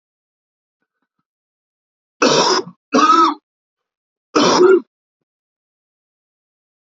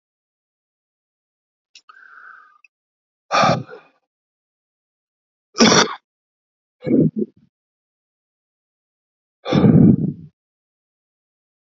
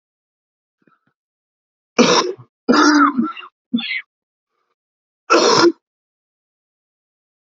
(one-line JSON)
{"three_cough_length": "7.0 s", "three_cough_amplitude": 29122, "three_cough_signal_mean_std_ratio": 0.35, "exhalation_length": "11.7 s", "exhalation_amplitude": 31365, "exhalation_signal_mean_std_ratio": 0.28, "cough_length": "7.6 s", "cough_amplitude": 28703, "cough_signal_mean_std_ratio": 0.36, "survey_phase": "alpha (2021-03-01 to 2021-08-12)", "age": "45-64", "gender": "Male", "wearing_mask": "No", "symptom_cough_any": true, "symptom_new_continuous_cough": true, "symptom_change_to_sense_of_smell_or_taste": true, "symptom_loss_of_taste": true, "symptom_onset": "3 days", "smoker_status": "Current smoker (e-cigarettes or vapes only)", "respiratory_condition_asthma": false, "respiratory_condition_other": false, "recruitment_source": "Test and Trace", "submission_delay": "1 day", "covid_test_result": "Positive", "covid_test_method": "RT-qPCR", "covid_ct_value": 14.3, "covid_ct_gene": "N gene", "covid_ct_mean": 14.8, "covid_viral_load": "14000000 copies/ml", "covid_viral_load_category": "High viral load (>1M copies/ml)"}